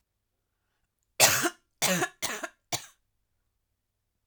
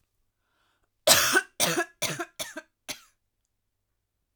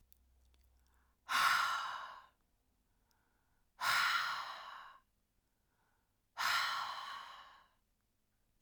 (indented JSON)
{
  "three_cough_length": "4.3 s",
  "three_cough_amplitude": 19354,
  "three_cough_signal_mean_std_ratio": 0.31,
  "cough_length": "4.4 s",
  "cough_amplitude": 28762,
  "cough_signal_mean_std_ratio": 0.33,
  "exhalation_length": "8.6 s",
  "exhalation_amplitude": 3349,
  "exhalation_signal_mean_std_ratio": 0.43,
  "survey_phase": "alpha (2021-03-01 to 2021-08-12)",
  "age": "18-44",
  "gender": "Female",
  "wearing_mask": "No",
  "symptom_cough_any": true,
  "symptom_fatigue": true,
  "symptom_headache": true,
  "symptom_change_to_sense_of_smell_or_taste": true,
  "smoker_status": "Never smoked",
  "respiratory_condition_asthma": false,
  "respiratory_condition_other": false,
  "recruitment_source": "Test and Trace",
  "submission_delay": "1 day",
  "covid_test_result": "Positive",
  "covid_test_method": "RT-qPCR",
  "covid_ct_value": 30.7,
  "covid_ct_gene": "ORF1ab gene",
  "covid_ct_mean": 31.1,
  "covid_viral_load": "63 copies/ml",
  "covid_viral_load_category": "Minimal viral load (< 10K copies/ml)"
}